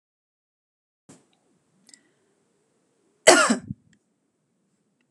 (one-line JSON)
{"cough_length": "5.1 s", "cough_amplitude": 32767, "cough_signal_mean_std_ratio": 0.18, "survey_phase": "beta (2021-08-13 to 2022-03-07)", "age": "45-64", "gender": "Female", "wearing_mask": "No", "symptom_none": true, "smoker_status": "Never smoked", "respiratory_condition_asthma": false, "respiratory_condition_other": false, "recruitment_source": "REACT", "submission_delay": "1 day", "covid_test_result": "Negative", "covid_test_method": "RT-qPCR"}